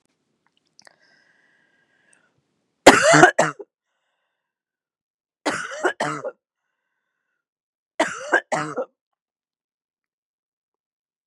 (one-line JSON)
{"three_cough_length": "11.3 s", "three_cough_amplitude": 32768, "three_cough_signal_mean_std_ratio": 0.24, "survey_phase": "beta (2021-08-13 to 2022-03-07)", "age": "45-64", "gender": "Female", "wearing_mask": "No", "symptom_cough_any": true, "symptom_new_continuous_cough": true, "symptom_runny_or_blocked_nose": true, "symptom_shortness_of_breath": true, "symptom_sore_throat": true, "symptom_fatigue": true, "symptom_fever_high_temperature": true, "symptom_headache": true, "symptom_onset": "2 days", "smoker_status": "Never smoked", "respiratory_condition_asthma": false, "respiratory_condition_other": false, "recruitment_source": "Test and Trace", "submission_delay": "1 day", "covid_test_result": "Positive", "covid_test_method": "ePCR"}